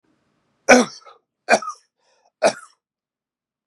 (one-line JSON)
{"three_cough_length": "3.7 s", "three_cough_amplitude": 32768, "three_cough_signal_mean_std_ratio": 0.24, "survey_phase": "beta (2021-08-13 to 2022-03-07)", "age": "18-44", "gender": "Male", "wearing_mask": "No", "symptom_sore_throat": true, "symptom_fatigue": true, "smoker_status": "Never smoked", "respiratory_condition_asthma": false, "respiratory_condition_other": false, "recruitment_source": "Test and Trace", "submission_delay": "0 days", "covid_test_result": "Positive", "covid_test_method": "RT-qPCR", "covid_ct_value": 16.9, "covid_ct_gene": "N gene"}